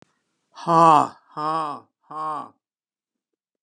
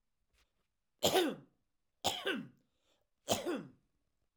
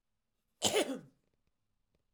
exhalation_length: 3.6 s
exhalation_amplitude: 25240
exhalation_signal_mean_std_ratio: 0.34
three_cough_length: 4.4 s
three_cough_amplitude: 5132
three_cough_signal_mean_std_ratio: 0.36
cough_length: 2.1 s
cough_amplitude: 7275
cough_signal_mean_std_ratio: 0.3
survey_phase: alpha (2021-03-01 to 2021-08-12)
age: 65+
gender: Male
wearing_mask: 'No'
symptom_cough_any: true
symptom_onset: 13 days
smoker_status: Never smoked
respiratory_condition_asthma: false
respiratory_condition_other: false
recruitment_source: REACT
submission_delay: 1 day
covid_test_result: Negative
covid_test_method: RT-qPCR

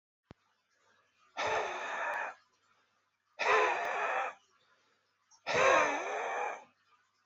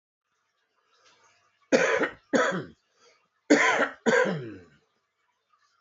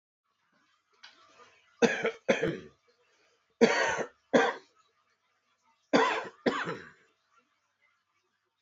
exhalation_length: 7.3 s
exhalation_amplitude: 6042
exhalation_signal_mean_std_ratio: 0.51
cough_length: 5.8 s
cough_amplitude: 18504
cough_signal_mean_std_ratio: 0.4
three_cough_length: 8.6 s
three_cough_amplitude: 15508
three_cough_signal_mean_std_ratio: 0.33
survey_phase: alpha (2021-03-01 to 2021-08-12)
age: 18-44
gender: Male
wearing_mask: 'No'
symptom_cough_any: true
symptom_headache: true
symptom_change_to_sense_of_smell_or_taste: true
symptom_onset: 4 days
smoker_status: Current smoker (11 or more cigarettes per day)
respiratory_condition_asthma: false
respiratory_condition_other: false
recruitment_source: Test and Trace
submission_delay: 3 days
covid_test_result: Positive
covid_test_method: RT-qPCR
covid_ct_value: 22.5
covid_ct_gene: ORF1ab gene
covid_ct_mean: 22.9
covid_viral_load: 32000 copies/ml
covid_viral_load_category: Low viral load (10K-1M copies/ml)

